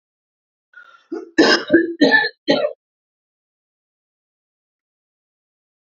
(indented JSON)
{
  "cough_length": "5.9 s",
  "cough_amplitude": 29650,
  "cough_signal_mean_std_ratio": 0.32,
  "survey_phase": "beta (2021-08-13 to 2022-03-07)",
  "age": "18-44",
  "gender": "Female",
  "wearing_mask": "No",
  "symptom_cough_any": true,
  "symptom_runny_or_blocked_nose": true,
  "symptom_shortness_of_breath": true,
  "symptom_sore_throat": true,
  "symptom_diarrhoea": true,
  "symptom_fever_high_temperature": true,
  "symptom_headache": true,
  "symptom_change_to_sense_of_smell_or_taste": true,
  "symptom_onset": "3 days",
  "smoker_status": "Current smoker (e-cigarettes or vapes only)",
  "respiratory_condition_asthma": false,
  "respiratory_condition_other": false,
  "recruitment_source": "Test and Trace",
  "submission_delay": "2 days",
  "covid_test_result": "Positive",
  "covid_test_method": "RT-qPCR",
  "covid_ct_value": 15.5,
  "covid_ct_gene": "ORF1ab gene",
  "covid_ct_mean": 15.9,
  "covid_viral_load": "6100000 copies/ml",
  "covid_viral_load_category": "High viral load (>1M copies/ml)"
}